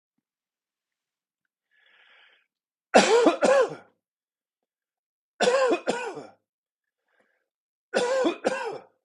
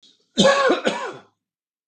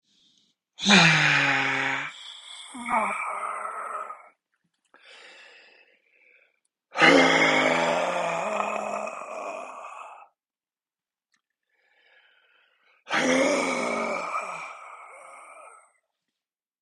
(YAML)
three_cough_length: 9.0 s
three_cough_amplitude: 26131
three_cough_signal_mean_std_ratio: 0.36
cough_length: 1.9 s
cough_amplitude: 23973
cough_signal_mean_std_ratio: 0.48
exhalation_length: 16.8 s
exhalation_amplitude: 26827
exhalation_signal_mean_std_ratio: 0.48
survey_phase: beta (2021-08-13 to 2022-03-07)
age: 45-64
gender: Male
wearing_mask: 'No'
symptom_none: true
smoker_status: Ex-smoker
respiratory_condition_asthma: false
respiratory_condition_other: false
recruitment_source: REACT
submission_delay: 3 days
covid_test_result: Negative
covid_test_method: RT-qPCR
influenza_a_test_result: Negative
influenza_b_test_result: Negative